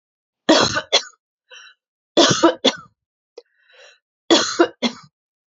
{"three_cough_length": "5.5 s", "three_cough_amplitude": 31118, "three_cough_signal_mean_std_ratio": 0.37, "survey_phase": "alpha (2021-03-01 to 2021-08-12)", "age": "45-64", "gender": "Female", "wearing_mask": "No", "symptom_none": true, "smoker_status": "Ex-smoker", "respiratory_condition_asthma": true, "respiratory_condition_other": false, "recruitment_source": "REACT", "submission_delay": "2 days", "covid_test_result": "Negative", "covid_test_method": "RT-qPCR"}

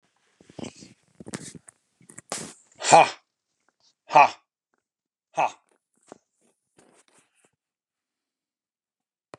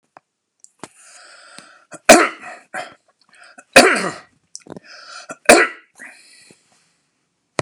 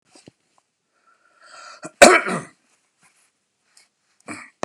{"exhalation_length": "9.4 s", "exhalation_amplitude": 29085, "exhalation_signal_mean_std_ratio": 0.18, "three_cough_length": "7.6 s", "three_cough_amplitude": 32768, "three_cough_signal_mean_std_ratio": 0.25, "cough_length": "4.6 s", "cough_amplitude": 32768, "cough_signal_mean_std_ratio": 0.19, "survey_phase": "beta (2021-08-13 to 2022-03-07)", "age": "45-64", "gender": "Male", "wearing_mask": "No", "symptom_none": true, "smoker_status": "Never smoked", "respiratory_condition_asthma": false, "respiratory_condition_other": false, "recruitment_source": "REACT", "submission_delay": "1 day", "covid_test_result": "Negative", "covid_test_method": "RT-qPCR"}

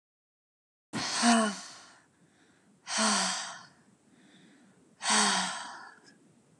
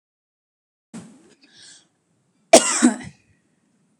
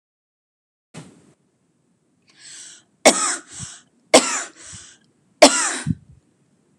{"exhalation_length": "6.6 s", "exhalation_amplitude": 11808, "exhalation_signal_mean_std_ratio": 0.44, "cough_length": "4.0 s", "cough_amplitude": 32768, "cough_signal_mean_std_ratio": 0.22, "three_cough_length": "6.8 s", "three_cough_amplitude": 32768, "three_cough_signal_mean_std_ratio": 0.26, "survey_phase": "beta (2021-08-13 to 2022-03-07)", "age": "18-44", "gender": "Female", "wearing_mask": "No", "symptom_runny_or_blocked_nose": true, "symptom_diarrhoea": true, "symptom_fatigue": true, "symptom_onset": "12 days", "smoker_status": "Never smoked", "respiratory_condition_asthma": false, "respiratory_condition_other": false, "recruitment_source": "REACT", "submission_delay": "5 days", "covid_test_result": "Negative", "covid_test_method": "RT-qPCR"}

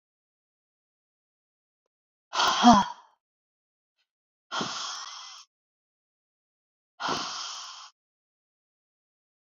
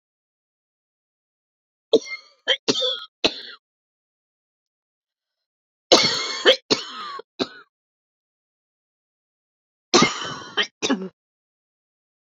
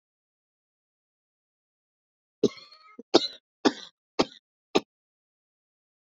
{"exhalation_length": "9.5 s", "exhalation_amplitude": 20955, "exhalation_signal_mean_std_ratio": 0.24, "three_cough_length": "12.2 s", "three_cough_amplitude": 32148, "three_cough_signal_mean_std_ratio": 0.29, "cough_length": "6.1 s", "cough_amplitude": 23187, "cough_signal_mean_std_ratio": 0.17, "survey_phase": "beta (2021-08-13 to 2022-03-07)", "age": "45-64", "gender": "Female", "wearing_mask": "No", "symptom_cough_any": true, "smoker_status": "Never smoked", "respiratory_condition_asthma": false, "respiratory_condition_other": false, "recruitment_source": "REACT", "submission_delay": "1 day", "covid_test_result": "Negative", "covid_test_method": "RT-qPCR"}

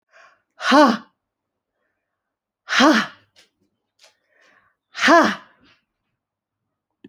{"exhalation_length": "7.1 s", "exhalation_amplitude": 31130, "exhalation_signal_mean_std_ratio": 0.29, "survey_phase": "alpha (2021-03-01 to 2021-08-12)", "age": "45-64", "gender": "Female", "wearing_mask": "No", "symptom_none": true, "smoker_status": "Never smoked", "respiratory_condition_asthma": false, "respiratory_condition_other": false, "recruitment_source": "REACT", "submission_delay": "4 days", "covid_test_method": "RT-qPCR"}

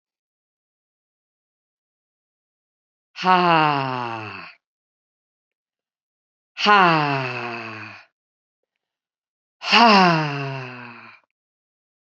{"exhalation_length": "12.1 s", "exhalation_amplitude": 29894, "exhalation_signal_mean_std_ratio": 0.34, "survey_phase": "beta (2021-08-13 to 2022-03-07)", "age": "45-64", "gender": "Female", "wearing_mask": "No", "symptom_cough_any": true, "symptom_runny_or_blocked_nose": true, "symptom_sore_throat": true, "symptom_abdominal_pain": true, "symptom_fatigue": true, "symptom_onset": "5 days", "smoker_status": "Ex-smoker", "respiratory_condition_asthma": false, "respiratory_condition_other": false, "recruitment_source": "Test and Trace", "submission_delay": "2 days", "covid_test_result": "Positive", "covid_test_method": "RT-qPCR"}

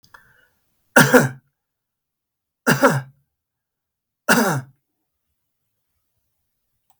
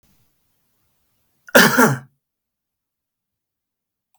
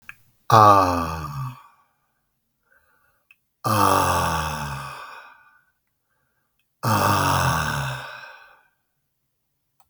{"three_cough_length": "7.0 s", "three_cough_amplitude": 32768, "three_cough_signal_mean_std_ratio": 0.27, "cough_length": "4.2 s", "cough_amplitude": 32768, "cough_signal_mean_std_ratio": 0.24, "exhalation_length": "9.9 s", "exhalation_amplitude": 32766, "exhalation_signal_mean_std_ratio": 0.43, "survey_phase": "beta (2021-08-13 to 2022-03-07)", "age": "65+", "gender": "Male", "wearing_mask": "No", "symptom_none": true, "smoker_status": "Never smoked", "respiratory_condition_asthma": false, "respiratory_condition_other": false, "recruitment_source": "REACT", "submission_delay": "2 days", "covid_test_result": "Negative", "covid_test_method": "RT-qPCR"}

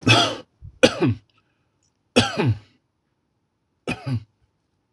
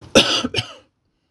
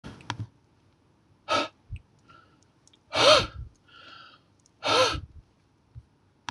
{"three_cough_length": "4.9 s", "three_cough_amplitude": 26028, "three_cough_signal_mean_std_ratio": 0.36, "cough_length": "1.3 s", "cough_amplitude": 26028, "cough_signal_mean_std_ratio": 0.41, "exhalation_length": "6.5 s", "exhalation_amplitude": 18911, "exhalation_signal_mean_std_ratio": 0.31, "survey_phase": "beta (2021-08-13 to 2022-03-07)", "age": "45-64", "gender": "Male", "wearing_mask": "No", "symptom_none": true, "smoker_status": "Never smoked", "respiratory_condition_asthma": false, "respiratory_condition_other": false, "recruitment_source": "REACT", "submission_delay": "1 day", "covid_test_result": "Negative", "covid_test_method": "RT-qPCR", "influenza_a_test_result": "Negative", "influenza_b_test_result": "Negative"}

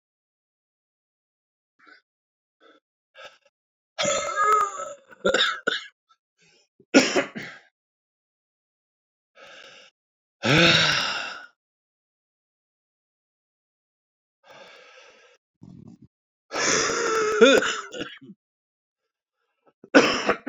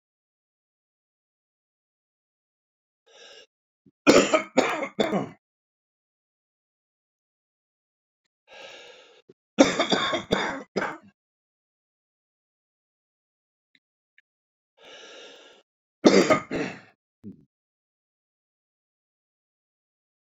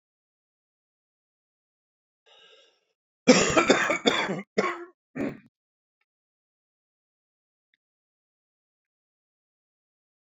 {"exhalation_length": "20.5 s", "exhalation_amplitude": 27301, "exhalation_signal_mean_std_ratio": 0.34, "three_cough_length": "20.4 s", "three_cough_amplitude": 27686, "three_cough_signal_mean_std_ratio": 0.24, "cough_length": "10.2 s", "cough_amplitude": 23379, "cough_signal_mean_std_ratio": 0.25, "survey_phase": "beta (2021-08-13 to 2022-03-07)", "age": "45-64", "gender": "Male", "wearing_mask": "No", "symptom_cough_any": true, "symptom_diarrhoea": true, "symptom_fatigue": true, "symptom_headache": true, "symptom_change_to_sense_of_smell_or_taste": true, "symptom_onset": "3 days", "smoker_status": "Current smoker (1 to 10 cigarettes per day)", "respiratory_condition_asthma": false, "respiratory_condition_other": false, "recruitment_source": "Test and Trace", "submission_delay": "2 days", "covid_test_result": "Positive", "covid_test_method": "RT-qPCR", "covid_ct_value": 15.3, "covid_ct_gene": "ORF1ab gene", "covid_ct_mean": 15.7, "covid_viral_load": "7100000 copies/ml", "covid_viral_load_category": "High viral load (>1M copies/ml)"}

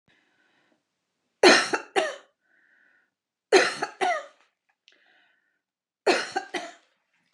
{"three_cough_length": "7.3 s", "three_cough_amplitude": 26096, "three_cough_signal_mean_std_ratio": 0.3, "survey_phase": "beta (2021-08-13 to 2022-03-07)", "age": "45-64", "gender": "Female", "wearing_mask": "No", "symptom_none": true, "smoker_status": "Never smoked", "respiratory_condition_asthma": true, "respiratory_condition_other": false, "recruitment_source": "REACT", "submission_delay": "0 days", "covid_test_result": "Negative", "covid_test_method": "RT-qPCR", "influenza_a_test_result": "Negative", "influenza_b_test_result": "Negative"}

